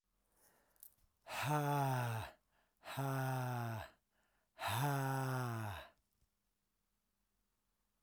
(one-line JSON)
{"exhalation_length": "8.0 s", "exhalation_amplitude": 2097, "exhalation_signal_mean_std_ratio": 0.56, "survey_phase": "alpha (2021-03-01 to 2021-08-12)", "age": "18-44", "gender": "Male", "wearing_mask": "No", "symptom_none": true, "symptom_cough_any": true, "symptom_new_continuous_cough": true, "symptom_fever_high_temperature": true, "symptom_headache": true, "smoker_status": "Current smoker (e-cigarettes or vapes only)", "respiratory_condition_asthma": false, "respiratory_condition_other": false, "recruitment_source": "Test and Trace", "submission_delay": "2 days", "covid_test_result": "Positive", "covid_test_method": "RT-qPCR", "covid_ct_value": 16.7, "covid_ct_gene": "ORF1ab gene", "covid_ct_mean": 17.7, "covid_viral_load": "1500000 copies/ml", "covid_viral_load_category": "High viral load (>1M copies/ml)"}